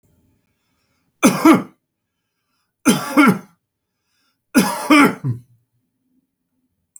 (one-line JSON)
{"three_cough_length": "7.0 s", "three_cough_amplitude": 32768, "three_cough_signal_mean_std_ratio": 0.34, "survey_phase": "beta (2021-08-13 to 2022-03-07)", "age": "65+", "gender": "Male", "wearing_mask": "No", "symptom_none": true, "smoker_status": "Never smoked", "respiratory_condition_asthma": false, "respiratory_condition_other": false, "recruitment_source": "REACT", "submission_delay": "3 days", "covid_test_result": "Negative", "covid_test_method": "RT-qPCR"}